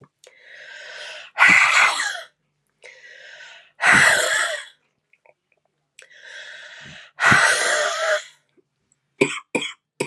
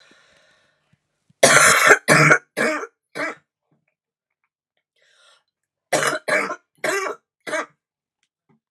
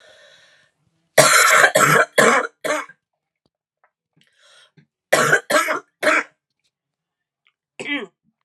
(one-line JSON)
{"exhalation_length": "10.1 s", "exhalation_amplitude": 30037, "exhalation_signal_mean_std_ratio": 0.45, "three_cough_length": "8.7 s", "three_cough_amplitude": 32768, "three_cough_signal_mean_std_ratio": 0.36, "cough_length": "8.4 s", "cough_amplitude": 32768, "cough_signal_mean_std_ratio": 0.4, "survey_phase": "alpha (2021-03-01 to 2021-08-12)", "age": "18-44", "gender": "Female", "wearing_mask": "Yes", "symptom_cough_any": true, "symptom_shortness_of_breath": true, "symptom_fatigue": true, "symptom_fever_high_temperature": true, "symptom_headache": true, "symptom_change_to_sense_of_smell_or_taste": true, "symptom_loss_of_taste": true, "smoker_status": "Never smoked", "respiratory_condition_asthma": false, "respiratory_condition_other": false, "recruitment_source": "Test and Trace", "submission_delay": "2 days", "covid_test_result": "Positive", "covid_test_method": "RT-qPCR", "covid_ct_value": 12.5, "covid_ct_gene": "ORF1ab gene", "covid_ct_mean": 13.1, "covid_viral_load": "50000000 copies/ml", "covid_viral_load_category": "High viral load (>1M copies/ml)"}